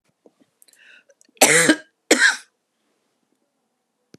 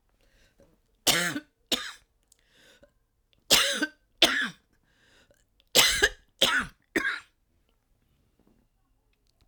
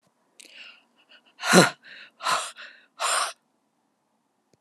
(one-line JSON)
{"cough_length": "4.2 s", "cough_amplitude": 31881, "cough_signal_mean_std_ratio": 0.29, "three_cough_length": "9.5 s", "three_cough_amplitude": 25298, "three_cough_signal_mean_std_ratio": 0.32, "exhalation_length": "4.6 s", "exhalation_amplitude": 32745, "exhalation_signal_mean_std_ratio": 0.3, "survey_phase": "alpha (2021-03-01 to 2021-08-12)", "age": "65+", "gender": "Female", "wearing_mask": "No", "symptom_abdominal_pain": true, "symptom_diarrhoea": true, "smoker_status": "Never smoked", "respiratory_condition_asthma": false, "respiratory_condition_other": false, "recruitment_source": "REACT", "submission_delay": "8 days", "covid_test_result": "Negative", "covid_test_method": "RT-qPCR"}